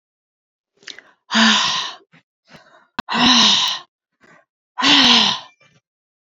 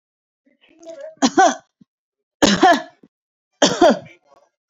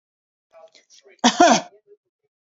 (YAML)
exhalation_length: 6.4 s
exhalation_amplitude: 31221
exhalation_signal_mean_std_ratio: 0.44
three_cough_length: 4.7 s
three_cough_amplitude: 29165
three_cough_signal_mean_std_ratio: 0.36
cough_length: 2.6 s
cough_amplitude: 32767
cough_signal_mean_std_ratio: 0.28
survey_phase: beta (2021-08-13 to 2022-03-07)
age: 45-64
gender: Female
wearing_mask: 'No'
symptom_none: true
smoker_status: Never smoked
respiratory_condition_asthma: false
respiratory_condition_other: false
recruitment_source: REACT
submission_delay: 2 days
covid_test_result: Negative
covid_test_method: RT-qPCR
influenza_a_test_result: Negative
influenza_b_test_result: Negative